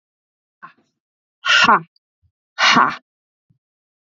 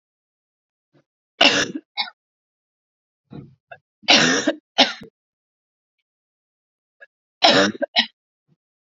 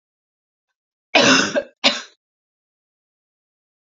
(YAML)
exhalation_length: 4.1 s
exhalation_amplitude: 32297
exhalation_signal_mean_std_ratio: 0.32
three_cough_length: 8.9 s
three_cough_amplitude: 32767
three_cough_signal_mean_std_ratio: 0.29
cough_length: 3.8 s
cough_amplitude: 29339
cough_signal_mean_std_ratio: 0.3
survey_phase: alpha (2021-03-01 to 2021-08-12)
age: 18-44
gender: Female
wearing_mask: 'No'
symptom_cough_any: true
symptom_fever_high_temperature: true
symptom_headache: true
symptom_change_to_sense_of_smell_or_taste: true
smoker_status: Never smoked
respiratory_condition_asthma: false
respiratory_condition_other: false
recruitment_source: Test and Trace
submission_delay: 1 day
covid_test_result: Positive
covid_test_method: RT-qPCR
covid_ct_value: 27.1
covid_ct_gene: ORF1ab gene